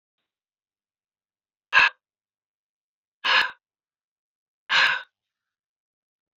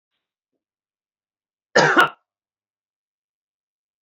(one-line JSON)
{"exhalation_length": "6.4 s", "exhalation_amplitude": 21690, "exhalation_signal_mean_std_ratio": 0.25, "cough_length": "4.0 s", "cough_amplitude": 28637, "cough_signal_mean_std_ratio": 0.22, "survey_phase": "alpha (2021-03-01 to 2021-08-12)", "age": "45-64", "gender": "Male", "wearing_mask": "No", "symptom_none": true, "smoker_status": "Never smoked", "respiratory_condition_asthma": false, "respiratory_condition_other": false, "recruitment_source": "Test and Trace", "submission_delay": "0 days", "covid_test_result": "Negative", "covid_test_method": "LFT"}